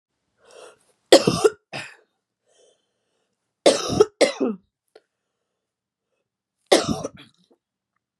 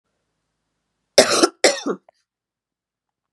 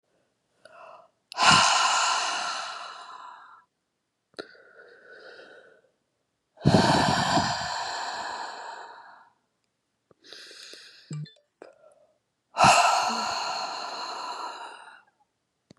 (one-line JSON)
{"three_cough_length": "8.2 s", "three_cough_amplitude": 32768, "three_cough_signal_mean_std_ratio": 0.26, "cough_length": "3.3 s", "cough_amplitude": 32768, "cough_signal_mean_std_ratio": 0.27, "exhalation_length": "15.8 s", "exhalation_amplitude": 20901, "exhalation_signal_mean_std_ratio": 0.44, "survey_phase": "beta (2021-08-13 to 2022-03-07)", "age": "18-44", "gender": "Female", "wearing_mask": "No", "symptom_cough_any": true, "symptom_runny_or_blocked_nose": true, "symptom_fatigue": true, "symptom_headache": true, "symptom_other": true, "smoker_status": "Never smoked", "respiratory_condition_asthma": false, "respiratory_condition_other": false, "recruitment_source": "Test and Trace", "submission_delay": "1 day", "covid_test_result": "Positive", "covid_test_method": "LFT"}